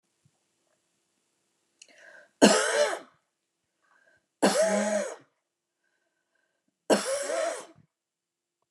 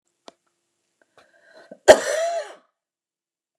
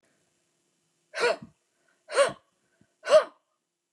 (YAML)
three_cough_length: 8.7 s
three_cough_amplitude: 21159
three_cough_signal_mean_std_ratio: 0.35
cough_length: 3.6 s
cough_amplitude: 29204
cough_signal_mean_std_ratio: 0.22
exhalation_length: 3.9 s
exhalation_amplitude: 14281
exhalation_signal_mean_std_ratio: 0.27
survey_phase: beta (2021-08-13 to 2022-03-07)
age: 45-64
gender: Female
wearing_mask: 'No'
symptom_none: true
smoker_status: Ex-smoker
respiratory_condition_asthma: false
respiratory_condition_other: false
recruitment_source: REACT
submission_delay: 1 day
covid_test_result: Negative
covid_test_method: RT-qPCR
influenza_a_test_result: Negative
influenza_b_test_result: Negative